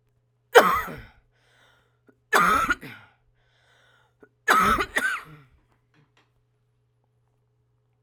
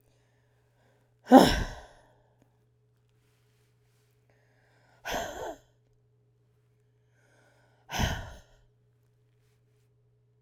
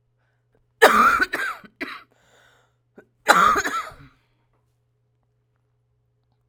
{
  "three_cough_length": "8.0 s",
  "three_cough_amplitude": 32767,
  "three_cough_signal_mean_std_ratio": 0.32,
  "exhalation_length": "10.4 s",
  "exhalation_amplitude": 26240,
  "exhalation_signal_mean_std_ratio": 0.18,
  "cough_length": "6.5 s",
  "cough_amplitude": 32767,
  "cough_signal_mean_std_ratio": 0.32,
  "survey_phase": "alpha (2021-03-01 to 2021-08-12)",
  "age": "45-64",
  "gender": "Female",
  "wearing_mask": "No",
  "symptom_none": true,
  "smoker_status": "Current smoker (11 or more cigarettes per day)",
  "respiratory_condition_asthma": false,
  "respiratory_condition_other": false,
  "recruitment_source": "REACT",
  "submission_delay": "1 day",
  "covid_test_result": "Negative",
  "covid_test_method": "RT-qPCR"
}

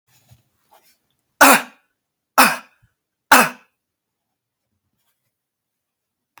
{
  "three_cough_length": "6.4 s",
  "three_cough_amplitude": 32768,
  "three_cough_signal_mean_std_ratio": 0.22,
  "survey_phase": "alpha (2021-03-01 to 2021-08-12)",
  "age": "18-44",
  "gender": "Male",
  "wearing_mask": "No",
  "symptom_fatigue": true,
  "symptom_fever_high_temperature": true,
  "symptom_onset": "3 days",
  "smoker_status": "Never smoked",
  "respiratory_condition_asthma": false,
  "respiratory_condition_other": false,
  "recruitment_source": "Test and Trace",
  "submission_delay": "2 days",
  "covid_ct_value": 26.9,
  "covid_ct_gene": "ORF1ab gene"
}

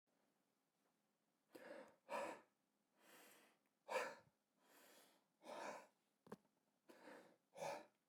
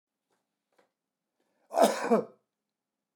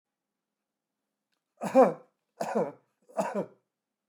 {
  "exhalation_length": "8.1 s",
  "exhalation_amplitude": 737,
  "exhalation_signal_mean_std_ratio": 0.38,
  "cough_length": "3.2 s",
  "cough_amplitude": 13384,
  "cough_signal_mean_std_ratio": 0.27,
  "three_cough_length": "4.1 s",
  "three_cough_amplitude": 10379,
  "three_cough_signal_mean_std_ratio": 0.29,
  "survey_phase": "beta (2021-08-13 to 2022-03-07)",
  "age": "65+",
  "gender": "Male",
  "wearing_mask": "No",
  "symptom_none": true,
  "smoker_status": "Never smoked",
  "respiratory_condition_asthma": false,
  "respiratory_condition_other": false,
  "recruitment_source": "Test and Trace",
  "submission_delay": "2 days",
  "covid_test_result": "Positive",
  "covid_test_method": "LFT"
}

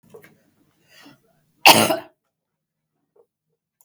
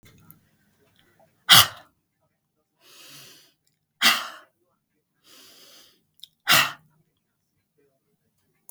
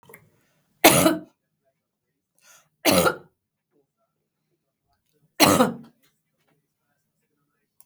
{
  "cough_length": "3.8 s",
  "cough_amplitude": 32768,
  "cough_signal_mean_std_ratio": 0.21,
  "exhalation_length": "8.7 s",
  "exhalation_amplitude": 32766,
  "exhalation_signal_mean_std_ratio": 0.2,
  "three_cough_length": "7.9 s",
  "three_cough_amplitude": 32766,
  "three_cough_signal_mean_std_ratio": 0.26,
  "survey_phase": "beta (2021-08-13 to 2022-03-07)",
  "age": "65+",
  "gender": "Female",
  "wearing_mask": "No",
  "symptom_none": true,
  "smoker_status": "Never smoked",
  "respiratory_condition_asthma": true,
  "respiratory_condition_other": false,
  "recruitment_source": "REACT",
  "submission_delay": "1 day",
  "covid_test_result": "Negative",
  "covid_test_method": "RT-qPCR",
  "influenza_a_test_result": "Negative",
  "influenza_b_test_result": "Negative"
}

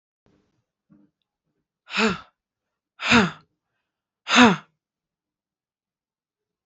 {
  "exhalation_length": "6.7 s",
  "exhalation_amplitude": 24936,
  "exhalation_signal_mean_std_ratio": 0.25,
  "survey_phase": "beta (2021-08-13 to 2022-03-07)",
  "age": "45-64",
  "gender": "Female",
  "wearing_mask": "No",
  "symptom_none": true,
  "smoker_status": "Never smoked",
  "respiratory_condition_asthma": false,
  "respiratory_condition_other": false,
  "recruitment_source": "REACT",
  "submission_delay": "2 days",
  "covid_test_result": "Negative",
  "covid_test_method": "RT-qPCR"
}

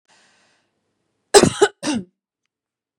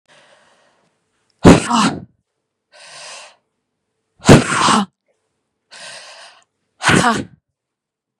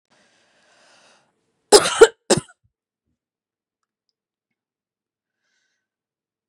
{
  "cough_length": "3.0 s",
  "cough_amplitude": 32768,
  "cough_signal_mean_std_ratio": 0.25,
  "exhalation_length": "8.2 s",
  "exhalation_amplitude": 32768,
  "exhalation_signal_mean_std_ratio": 0.31,
  "three_cough_length": "6.5 s",
  "three_cough_amplitude": 32768,
  "three_cough_signal_mean_std_ratio": 0.16,
  "survey_phase": "beta (2021-08-13 to 2022-03-07)",
  "age": "45-64",
  "gender": "Female",
  "wearing_mask": "No",
  "symptom_runny_or_blocked_nose": true,
  "smoker_status": "Ex-smoker",
  "respiratory_condition_asthma": false,
  "respiratory_condition_other": false,
  "recruitment_source": "REACT",
  "submission_delay": "1 day",
  "covid_test_result": "Negative",
  "covid_test_method": "RT-qPCR",
  "influenza_a_test_result": "Negative",
  "influenza_b_test_result": "Negative"
}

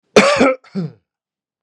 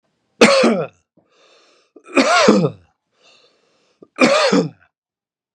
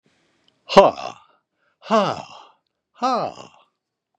{
  "cough_length": "1.6 s",
  "cough_amplitude": 32768,
  "cough_signal_mean_std_ratio": 0.43,
  "three_cough_length": "5.5 s",
  "three_cough_amplitude": 32768,
  "three_cough_signal_mean_std_ratio": 0.43,
  "exhalation_length": "4.2 s",
  "exhalation_amplitude": 32768,
  "exhalation_signal_mean_std_ratio": 0.29,
  "survey_phase": "beta (2021-08-13 to 2022-03-07)",
  "age": "45-64",
  "gender": "Male",
  "wearing_mask": "No",
  "symptom_none": true,
  "smoker_status": "Ex-smoker",
  "respiratory_condition_asthma": false,
  "respiratory_condition_other": false,
  "recruitment_source": "REACT",
  "submission_delay": "3 days",
  "covid_test_result": "Negative",
  "covid_test_method": "RT-qPCR",
  "influenza_a_test_result": "Negative",
  "influenza_b_test_result": "Negative"
}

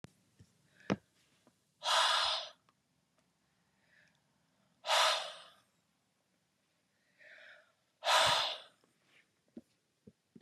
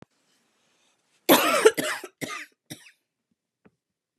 {
  "exhalation_length": "10.4 s",
  "exhalation_amplitude": 5227,
  "exhalation_signal_mean_std_ratio": 0.32,
  "cough_length": "4.2 s",
  "cough_amplitude": 29338,
  "cough_signal_mean_std_ratio": 0.29,
  "survey_phase": "beta (2021-08-13 to 2022-03-07)",
  "age": "18-44",
  "gender": "Female",
  "wearing_mask": "No",
  "symptom_sore_throat": true,
  "symptom_fatigue": true,
  "symptom_onset": "3 days",
  "smoker_status": "Never smoked",
  "respiratory_condition_asthma": false,
  "respiratory_condition_other": false,
  "recruitment_source": "REACT",
  "submission_delay": "1 day",
  "covid_test_result": "Negative",
  "covid_test_method": "RT-qPCR",
  "influenza_a_test_result": "Negative",
  "influenza_b_test_result": "Negative"
}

